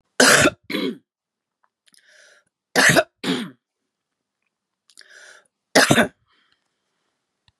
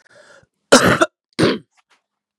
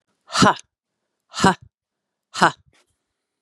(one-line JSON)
{"three_cough_length": "7.6 s", "three_cough_amplitude": 32629, "three_cough_signal_mean_std_ratio": 0.31, "cough_length": "2.4 s", "cough_amplitude": 32768, "cough_signal_mean_std_ratio": 0.35, "exhalation_length": "3.4 s", "exhalation_amplitude": 32301, "exhalation_signal_mean_std_ratio": 0.27, "survey_phase": "beta (2021-08-13 to 2022-03-07)", "age": "45-64", "gender": "Female", "wearing_mask": "No", "symptom_cough_any": true, "symptom_runny_or_blocked_nose": true, "symptom_fatigue": true, "symptom_headache": true, "symptom_other": true, "symptom_onset": "2 days", "smoker_status": "Never smoked", "respiratory_condition_asthma": false, "respiratory_condition_other": false, "recruitment_source": "Test and Trace", "submission_delay": "1 day", "covid_test_result": "Positive", "covid_test_method": "RT-qPCR", "covid_ct_value": 19.3, "covid_ct_gene": "N gene"}